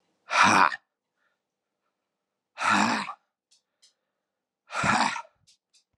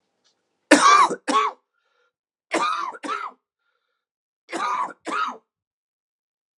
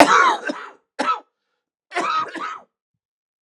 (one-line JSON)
{"exhalation_length": "6.0 s", "exhalation_amplitude": 17561, "exhalation_signal_mean_std_ratio": 0.36, "three_cough_length": "6.6 s", "three_cough_amplitude": 32767, "three_cough_signal_mean_std_ratio": 0.37, "cough_length": "3.4 s", "cough_amplitude": 32768, "cough_signal_mean_std_ratio": 0.42, "survey_phase": "beta (2021-08-13 to 2022-03-07)", "age": "45-64", "gender": "Male", "wearing_mask": "No", "symptom_cough_any": true, "symptom_new_continuous_cough": true, "symptom_sore_throat": true, "symptom_fatigue": true, "symptom_headache": true, "symptom_onset": "3 days", "smoker_status": "Never smoked", "respiratory_condition_asthma": false, "respiratory_condition_other": false, "recruitment_source": "REACT", "submission_delay": "1 day", "covid_test_result": "Positive", "covid_test_method": "RT-qPCR", "covid_ct_value": 18.6, "covid_ct_gene": "E gene", "influenza_a_test_result": "Negative", "influenza_b_test_result": "Negative"}